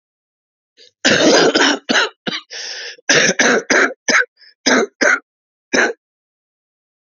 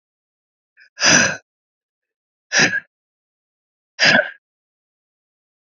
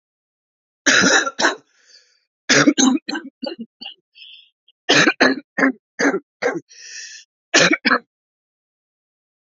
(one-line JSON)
{"cough_length": "7.1 s", "cough_amplitude": 32563, "cough_signal_mean_std_ratio": 0.51, "exhalation_length": "5.7 s", "exhalation_amplitude": 30945, "exhalation_signal_mean_std_ratio": 0.3, "three_cough_length": "9.5 s", "three_cough_amplitude": 30279, "three_cough_signal_mean_std_ratio": 0.41, "survey_phase": "alpha (2021-03-01 to 2021-08-12)", "age": "45-64", "gender": "Male", "wearing_mask": "No", "symptom_cough_any": true, "symptom_diarrhoea": true, "symptom_fatigue": true, "symptom_headache": true, "symptom_change_to_sense_of_smell_or_taste": true, "symptom_onset": "3 days", "smoker_status": "Never smoked", "respiratory_condition_asthma": false, "respiratory_condition_other": false, "recruitment_source": "Test and Trace", "submission_delay": "1 day", "covid_test_result": "Positive", "covid_test_method": "RT-qPCR"}